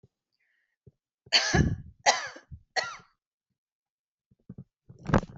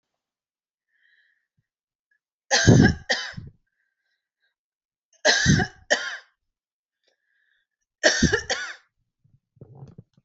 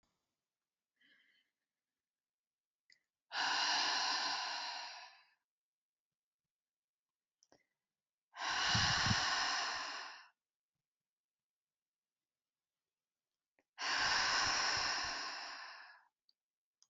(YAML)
cough_length: 5.4 s
cough_amplitude: 15062
cough_signal_mean_std_ratio: 0.31
three_cough_length: 10.2 s
three_cough_amplitude: 26979
three_cough_signal_mean_std_ratio: 0.3
exhalation_length: 16.9 s
exhalation_amplitude: 3130
exhalation_signal_mean_std_ratio: 0.46
survey_phase: alpha (2021-03-01 to 2021-08-12)
age: 45-64
gender: Female
wearing_mask: 'No'
symptom_none: true
smoker_status: Never smoked
respiratory_condition_asthma: false
respiratory_condition_other: false
recruitment_source: REACT
submission_delay: 2 days
covid_test_result: Negative
covid_test_method: RT-qPCR